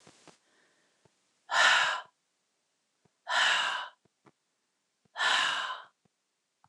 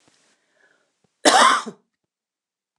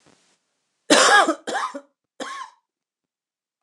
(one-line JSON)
{"exhalation_length": "6.7 s", "exhalation_amplitude": 10161, "exhalation_signal_mean_std_ratio": 0.39, "cough_length": "2.8 s", "cough_amplitude": 29204, "cough_signal_mean_std_ratio": 0.29, "three_cough_length": "3.6 s", "three_cough_amplitude": 29192, "three_cough_signal_mean_std_ratio": 0.34, "survey_phase": "beta (2021-08-13 to 2022-03-07)", "age": "45-64", "gender": "Female", "wearing_mask": "No", "symptom_cough_any": true, "symptom_new_continuous_cough": true, "symptom_runny_or_blocked_nose": true, "symptom_abdominal_pain": true, "symptom_onset": "2 days", "smoker_status": "Never smoked", "respiratory_condition_asthma": false, "respiratory_condition_other": false, "recruitment_source": "Test and Trace", "submission_delay": "2 days", "covid_test_result": "Positive", "covid_test_method": "RT-qPCR", "covid_ct_value": 21.0, "covid_ct_gene": "N gene"}